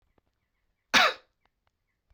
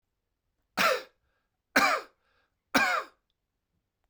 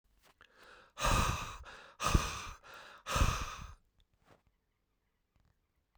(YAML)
cough_length: 2.1 s
cough_amplitude: 15616
cough_signal_mean_std_ratio: 0.23
three_cough_length: 4.1 s
three_cough_amplitude: 12702
three_cough_signal_mean_std_ratio: 0.34
exhalation_length: 6.0 s
exhalation_amplitude: 6493
exhalation_signal_mean_std_ratio: 0.39
survey_phase: beta (2021-08-13 to 2022-03-07)
age: 45-64
gender: Male
wearing_mask: 'No'
symptom_cough_any: true
symptom_runny_or_blocked_nose: true
symptom_fatigue: true
symptom_change_to_sense_of_smell_or_taste: true
smoker_status: Ex-smoker
respiratory_condition_asthma: false
respiratory_condition_other: false
recruitment_source: Test and Trace
submission_delay: 3 days
covid_test_result: Positive
covid_test_method: RT-qPCR